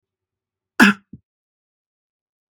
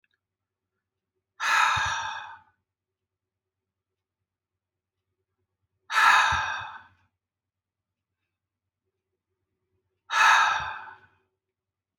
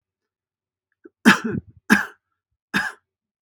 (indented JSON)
{
  "cough_length": "2.5 s",
  "cough_amplitude": 32767,
  "cough_signal_mean_std_ratio": 0.18,
  "exhalation_length": "12.0 s",
  "exhalation_amplitude": 16867,
  "exhalation_signal_mean_std_ratio": 0.32,
  "three_cough_length": "3.4 s",
  "three_cough_amplitude": 32768,
  "three_cough_signal_mean_std_ratio": 0.27,
  "survey_phase": "beta (2021-08-13 to 2022-03-07)",
  "age": "45-64",
  "gender": "Female",
  "wearing_mask": "No",
  "symptom_none": true,
  "smoker_status": "Ex-smoker",
  "respiratory_condition_asthma": false,
  "respiratory_condition_other": false,
  "recruitment_source": "REACT",
  "submission_delay": "2 days",
  "covid_test_result": "Negative",
  "covid_test_method": "RT-qPCR",
  "influenza_a_test_result": "Negative",
  "influenza_b_test_result": "Negative"
}